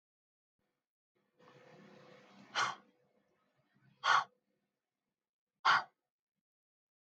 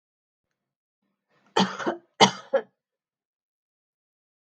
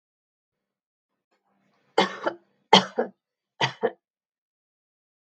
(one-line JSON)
{"exhalation_length": "7.1 s", "exhalation_amplitude": 5752, "exhalation_signal_mean_std_ratio": 0.22, "cough_length": "4.4 s", "cough_amplitude": 28503, "cough_signal_mean_std_ratio": 0.22, "three_cough_length": "5.3 s", "three_cough_amplitude": 32126, "three_cough_signal_mean_std_ratio": 0.22, "survey_phase": "beta (2021-08-13 to 2022-03-07)", "age": "45-64", "gender": "Female", "wearing_mask": "No", "symptom_none": true, "smoker_status": "Ex-smoker", "respiratory_condition_asthma": false, "respiratory_condition_other": false, "recruitment_source": "REACT", "submission_delay": "2 days", "covid_test_result": "Negative", "covid_test_method": "RT-qPCR", "influenza_a_test_result": "Negative", "influenza_b_test_result": "Negative"}